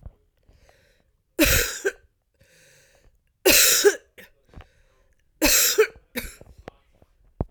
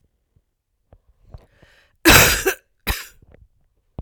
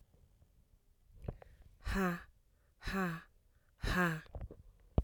{"three_cough_length": "7.5 s", "three_cough_amplitude": 25856, "three_cough_signal_mean_std_ratio": 0.36, "cough_length": "4.0 s", "cough_amplitude": 32768, "cough_signal_mean_std_ratio": 0.28, "exhalation_length": "5.0 s", "exhalation_amplitude": 5933, "exhalation_signal_mean_std_ratio": 0.43, "survey_phase": "alpha (2021-03-01 to 2021-08-12)", "age": "45-64", "gender": "Female", "wearing_mask": "No", "symptom_cough_any": true, "symptom_fatigue": true, "symptom_change_to_sense_of_smell_or_taste": true, "symptom_onset": "3 days", "smoker_status": "Never smoked", "respiratory_condition_asthma": false, "respiratory_condition_other": false, "recruitment_source": "Test and Trace", "submission_delay": "1 day", "covid_test_result": "Positive", "covid_test_method": "RT-qPCR", "covid_ct_value": 37.4, "covid_ct_gene": "N gene"}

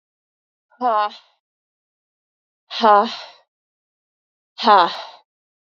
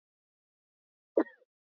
{"exhalation_length": "5.7 s", "exhalation_amplitude": 29514, "exhalation_signal_mean_std_ratio": 0.3, "cough_length": "1.8 s", "cough_amplitude": 7452, "cough_signal_mean_std_ratio": 0.14, "survey_phase": "beta (2021-08-13 to 2022-03-07)", "age": "18-44", "gender": "Female", "wearing_mask": "No", "symptom_cough_any": true, "symptom_runny_or_blocked_nose": true, "symptom_shortness_of_breath": true, "symptom_sore_throat": true, "symptom_fatigue": true, "symptom_fever_high_temperature": true, "symptom_onset": "3 days", "smoker_status": "Ex-smoker", "respiratory_condition_asthma": false, "respiratory_condition_other": false, "recruitment_source": "Test and Trace", "submission_delay": "1 day", "covid_test_result": "Positive", "covid_test_method": "ePCR"}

